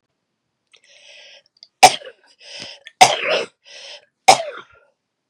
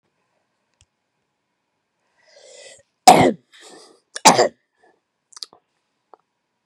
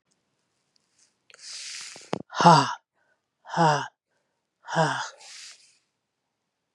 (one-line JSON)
{"three_cough_length": "5.3 s", "three_cough_amplitude": 32768, "three_cough_signal_mean_std_ratio": 0.25, "cough_length": "6.7 s", "cough_amplitude": 32768, "cough_signal_mean_std_ratio": 0.2, "exhalation_length": "6.7 s", "exhalation_amplitude": 29059, "exhalation_signal_mean_std_ratio": 0.29, "survey_phase": "beta (2021-08-13 to 2022-03-07)", "age": "45-64", "gender": "Female", "wearing_mask": "No", "symptom_cough_any": true, "symptom_runny_or_blocked_nose": true, "smoker_status": "Never smoked", "respiratory_condition_asthma": false, "respiratory_condition_other": false, "recruitment_source": "REACT", "submission_delay": "1 day", "covid_test_result": "Negative", "covid_test_method": "RT-qPCR", "influenza_a_test_result": "Unknown/Void", "influenza_b_test_result": "Unknown/Void"}